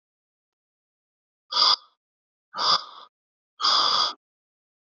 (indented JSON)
{
  "exhalation_length": "4.9 s",
  "exhalation_amplitude": 19364,
  "exhalation_signal_mean_std_ratio": 0.36,
  "survey_phase": "beta (2021-08-13 to 2022-03-07)",
  "age": "18-44",
  "gender": "Male",
  "wearing_mask": "No",
  "symptom_none": true,
  "smoker_status": "Never smoked",
  "respiratory_condition_asthma": false,
  "respiratory_condition_other": false,
  "recruitment_source": "REACT",
  "submission_delay": "1 day",
  "covid_test_result": "Negative",
  "covid_test_method": "RT-qPCR",
  "influenza_a_test_result": "Negative",
  "influenza_b_test_result": "Negative"
}